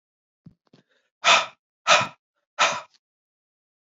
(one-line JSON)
{"exhalation_length": "3.8 s", "exhalation_amplitude": 26766, "exhalation_signal_mean_std_ratio": 0.29, "survey_phase": "beta (2021-08-13 to 2022-03-07)", "age": "45-64", "gender": "Female", "wearing_mask": "No", "symptom_cough_any": true, "symptom_runny_or_blocked_nose": true, "symptom_fatigue": true, "symptom_onset": "4 days", "smoker_status": "Current smoker (1 to 10 cigarettes per day)", "respiratory_condition_asthma": false, "respiratory_condition_other": false, "recruitment_source": "Test and Trace", "submission_delay": "2 days", "covid_test_result": "Positive", "covid_test_method": "ePCR"}